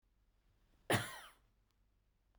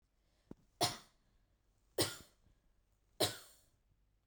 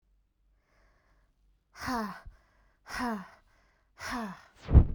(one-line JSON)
{"cough_length": "2.4 s", "cough_amplitude": 2989, "cough_signal_mean_std_ratio": 0.25, "three_cough_length": "4.3 s", "three_cough_amplitude": 3413, "three_cough_signal_mean_std_ratio": 0.26, "exhalation_length": "4.9 s", "exhalation_amplitude": 18449, "exhalation_signal_mean_std_ratio": 0.27, "survey_phase": "beta (2021-08-13 to 2022-03-07)", "age": "18-44", "gender": "Female", "wearing_mask": "No", "symptom_none": true, "smoker_status": "Never smoked", "respiratory_condition_asthma": false, "respiratory_condition_other": false, "recruitment_source": "REACT", "submission_delay": "0 days", "covid_test_result": "Negative", "covid_test_method": "RT-qPCR", "influenza_a_test_result": "Negative", "influenza_b_test_result": "Negative"}